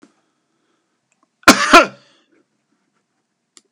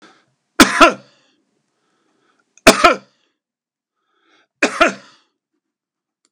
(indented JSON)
{
  "cough_length": "3.7 s",
  "cough_amplitude": 32768,
  "cough_signal_mean_std_ratio": 0.22,
  "three_cough_length": "6.3 s",
  "three_cough_amplitude": 32768,
  "three_cough_signal_mean_std_ratio": 0.25,
  "survey_phase": "beta (2021-08-13 to 2022-03-07)",
  "age": "65+",
  "gender": "Male",
  "wearing_mask": "No",
  "symptom_none": true,
  "smoker_status": "Ex-smoker",
  "respiratory_condition_asthma": false,
  "respiratory_condition_other": true,
  "recruitment_source": "REACT",
  "submission_delay": "2 days",
  "covid_test_result": "Negative",
  "covid_test_method": "RT-qPCR",
  "influenza_a_test_result": "Negative",
  "influenza_b_test_result": "Negative"
}